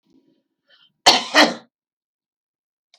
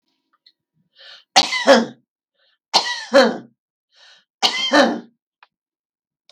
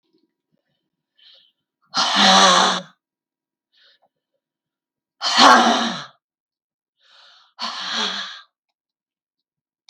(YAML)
cough_length: 3.0 s
cough_amplitude: 32768
cough_signal_mean_std_ratio: 0.25
three_cough_length: 6.3 s
three_cough_amplitude: 32768
three_cough_signal_mean_std_ratio: 0.35
exhalation_length: 9.9 s
exhalation_amplitude: 32768
exhalation_signal_mean_std_ratio: 0.34
survey_phase: beta (2021-08-13 to 2022-03-07)
age: 65+
gender: Female
wearing_mask: 'No'
symptom_none: true
smoker_status: Ex-smoker
respiratory_condition_asthma: true
respiratory_condition_other: false
recruitment_source: REACT
submission_delay: 2 days
covid_test_result: Negative
covid_test_method: RT-qPCR
influenza_a_test_result: Unknown/Void
influenza_b_test_result: Unknown/Void